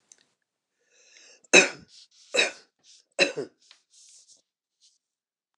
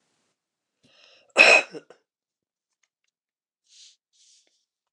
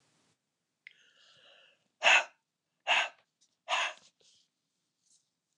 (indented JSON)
{
  "three_cough_length": "5.6 s",
  "three_cough_amplitude": 26196,
  "three_cough_signal_mean_std_ratio": 0.21,
  "cough_length": "4.9 s",
  "cough_amplitude": 29203,
  "cough_signal_mean_std_ratio": 0.18,
  "exhalation_length": "5.6 s",
  "exhalation_amplitude": 12575,
  "exhalation_signal_mean_std_ratio": 0.25,
  "survey_phase": "beta (2021-08-13 to 2022-03-07)",
  "age": "65+",
  "gender": "Male",
  "wearing_mask": "No",
  "symptom_runny_or_blocked_nose": true,
  "symptom_onset": "3 days",
  "smoker_status": "Ex-smoker",
  "respiratory_condition_asthma": false,
  "respiratory_condition_other": true,
  "recruitment_source": "REACT",
  "submission_delay": "1 day",
  "covid_test_result": "Negative",
  "covid_test_method": "RT-qPCR"
}